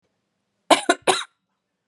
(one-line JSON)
{"cough_length": "1.9 s", "cough_amplitude": 32025, "cough_signal_mean_std_ratio": 0.27, "survey_phase": "beta (2021-08-13 to 2022-03-07)", "age": "18-44", "gender": "Female", "wearing_mask": "No", "symptom_cough_any": true, "symptom_runny_or_blocked_nose": true, "symptom_sore_throat": true, "symptom_headache": true, "symptom_onset": "3 days", "smoker_status": "Never smoked", "respiratory_condition_asthma": false, "respiratory_condition_other": false, "recruitment_source": "Test and Trace", "submission_delay": "1 day", "covid_test_result": "Positive", "covid_test_method": "RT-qPCR", "covid_ct_value": 27.7, "covid_ct_gene": "N gene"}